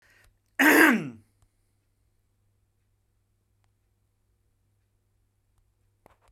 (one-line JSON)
{"cough_length": "6.3 s", "cough_amplitude": 22262, "cough_signal_mean_std_ratio": 0.22, "survey_phase": "beta (2021-08-13 to 2022-03-07)", "age": "45-64", "gender": "Male", "wearing_mask": "No", "symptom_none": true, "smoker_status": "Never smoked", "respiratory_condition_asthma": false, "respiratory_condition_other": false, "recruitment_source": "REACT", "submission_delay": "2 days", "covid_test_result": "Negative", "covid_test_method": "RT-qPCR"}